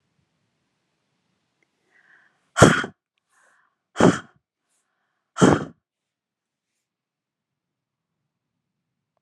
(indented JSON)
{
  "exhalation_length": "9.2 s",
  "exhalation_amplitude": 32768,
  "exhalation_signal_mean_std_ratio": 0.19,
  "survey_phase": "beta (2021-08-13 to 2022-03-07)",
  "age": "18-44",
  "gender": "Female",
  "wearing_mask": "No",
  "symptom_none": true,
  "smoker_status": "Never smoked",
  "respiratory_condition_asthma": false,
  "respiratory_condition_other": false,
  "recruitment_source": "REACT",
  "submission_delay": "2 days",
  "covid_test_result": "Negative",
  "covid_test_method": "RT-qPCR"
}